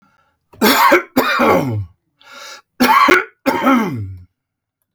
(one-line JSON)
{"cough_length": "4.9 s", "cough_amplitude": 32767, "cough_signal_mean_std_ratio": 0.57, "survey_phase": "alpha (2021-03-01 to 2021-08-12)", "age": "65+", "gender": "Male", "wearing_mask": "No", "symptom_none": true, "smoker_status": "Ex-smoker", "respiratory_condition_asthma": false, "respiratory_condition_other": false, "recruitment_source": "REACT", "submission_delay": "1 day", "covid_test_result": "Negative", "covid_test_method": "RT-qPCR"}